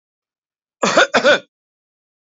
{"cough_length": "2.4 s", "cough_amplitude": 27659, "cough_signal_mean_std_ratio": 0.35, "survey_phase": "beta (2021-08-13 to 2022-03-07)", "age": "45-64", "gender": "Male", "wearing_mask": "No", "symptom_shortness_of_breath": true, "symptom_change_to_sense_of_smell_or_taste": true, "symptom_loss_of_taste": true, "smoker_status": "Never smoked", "respiratory_condition_asthma": false, "respiratory_condition_other": false, "recruitment_source": "REACT", "submission_delay": "1 day", "covid_test_result": "Negative", "covid_test_method": "RT-qPCR", "influenza_a_test_result": "Negative", "influenza_b_test_result": "Negative"}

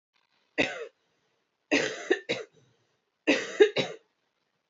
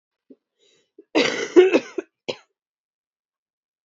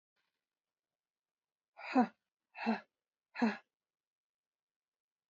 {"three_cough_length": "4.7 s", "three_cough_amplitude": 16520, "three_cough_signal_mean_std_ratio": 0.33, "cough_length": "3.8 s", "cough_amplitude": 27032, "cough_signal_mean_std_ratio": 0.28, "exhalation_length": "5.3 s", "exhalation_amplitude": 3969, "exhalation_signal_mean_std_ratio": 0.24, "survey_phase": "beta (2021-08-13 to 2022-03-07)", "age": "18-44", "gender": "Female", "wearing_mask": "No", "symptom_cough_any": true, "symptom_new_continuous_cough": true, "symptom_runny_or_blocked_nose": true, "symptom_abdominal_pain": true, "symptom_fatigue": true, "symptom_headache": true, "symptom_change_to_sense_of_smell_or_taste": true, "symptom_loss_of_taste": true, "symptom_onset": "4 days", "smoker_status": "Ex-smoker", "respiratory_condition_asthma": false, "respiratory_condition_other": false, "recruitment_source": "Test and Trace", "submission_delay": "3 days", "covid_test_result": "Positive", "covid_test_method": "ePCR"}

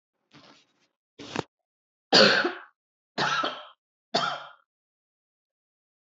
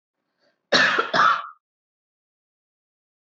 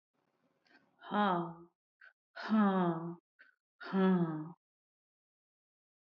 {"three_cough_length": "6.1 s", "three_cough_amplitude": 20935, "three_cough_signal_mean_std_ratio": 0.3, "cough_length": "3.2 s", "cough_amplitude": 21830, "cough_signal_mean_std_ratio": 0.35, "exhalation_length": "6.1 s", "exhalation_amplitude": 3864, "exhalation_signal_mean_std_ratio": 0.43, "survey_phase": "beta (2021-08-13 to 2022-03-07)", "age": "45-64", "gender": "Female", "wearing_mask": "No", "symptom_none": true, "smoker_status": "Never smoked", "respiratory_condition_asthma": false, "respiratory_condition_other": false, "recruitment_source": "REACT", "submission_delay": "2 days", "covid_test_result": "Negative", "covid_test_method": "RT-qPCR", "influenza_a_test_result": "Negative", "influenza_b_test_result": "Negative"}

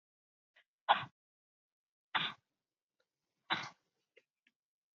{"exhalation_length": "4.9 s", "exhalation_amplitude": 7373, "exhalation_signal_mean_std_ratio": 0.2, "survey_phase": "beta (2021-08-13 to 2022-03-07)", "age": "45-64", "gender": "Female", "wearing_mask": "No", "symptom_cough_any": true, "symptom_runny_or_blocked_nose": true, "symptom_fatigue": true, "smoker_status": "Never smoked", "respiratory_condition_asthma": false, "respiratory_condition_other": false, "recruitment_source": "Test and Trace", "submission_delay": "3 days", "covid_test_result": "Positive", "covid_test_method": "LFT"}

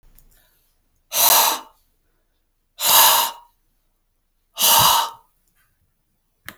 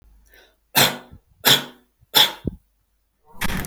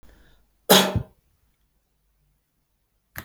{"exhalation_length": "6.6 s", "exhalation_amplitude": 32768, "exhalation_signal_mean_std_ratio": 0.38, "three_cough_length": "3.7 s", "three_cough_amplitude": 32767, "three_cough_signal_mean_std_ratio": 0.36, "cough_length": "3.2 s", "cough_amplitude": 32767, "cough_signal_mean_std_ratio": 0.22, "survey_phase": "alpha (2021-03-01 to 2021-08-12)", "age": "45-64", "gender": "Male", "wearing_mask": "No", "symptom_abdominal_pain": true, "symptom_onset": "12 days", "smoker_status": "Current smoker (e-cigarettes or vapes only)", "respiratory_condition_asthma": false, "respiratory_condition_other": false, "recruitment_source": "REACT", "submission_delay": "2 days", "covid_test_result": "Negative", "covid_test_method": "RT-qPCR"}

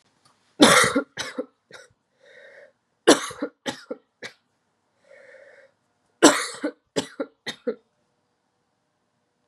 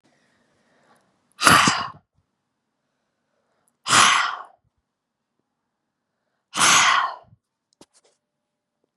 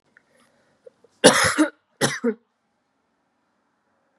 {"three_cough_length": "9.5 s", "three_cough_amplitude": 32767, "three_cough_signal_mean_std_ratio": 0.26, "exhalation_length": "9.0 s", "exhalation_amplitude": 32768, "exhalation_signal_mean_std_ratio": 0.31, "cough_length": "4.2 s", "cough_amplitude": 32767, "cough_signal_mean_std_ratio": 0.28, "survey_phase": "beta (2021-08-13 to 2022-03-07)", "age": "18-44", "gender": "Female", "wearing_mask": "No", "symptom_cough_any": true, "symptom_runny_or_blocked_nose": true, "symptom_sore_throat": true, "symptom_abdominal_pain": true, "symptom_fatigue": true, "symptom_headache": true, "symptom_onset": "4 days", "smoker_status": "Never smoked", "respiratory_condition_asthma": false, "respiratory_condition_other": false, "recruitment_source": "Test and Trace", "submission_delay": "1 day", "covid_test_result": "Positive", "covid_test_method": "ePCR"}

